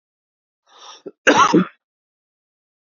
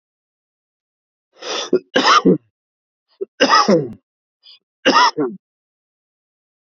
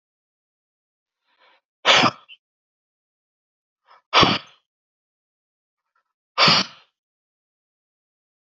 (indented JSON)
{
  "cough_length": "2.9 s",
  "cough_amplitude": 28380,
  "cough_signal_mean_std_ratio": 0.29,
  "three_cough_length": "6.7 s",
  "three_cough_amplitude": 30115,
  "three_cough_signal_mean_std_ratio": 0.37,
  "exhalation_length": "8.4 s",
  "exhalation_amplitude": 27420,
  "exhalation_signal_mean_std_ratio": 0.24,
  "survey_phase": "beta (2021-08-13 to 2022-03-07)",
  "age": "18-44",
  "gender": "Male",
  "wearing_mask": "No",
  "symptom_none": true,
  "smoker_status": "Never smoked",
  "respiratory_condition_asthma": false,
  "respiratory_condition_other": false,
  "recruitment_source": "REACT",
  "submission_delay": "6 days",
  "covid_test_result": "Negative",
  "covid_test_method": "RT-qPCR",
  "influenza_a_test_result": "Negative",
  "influenza_b_test_result": "Negative"
}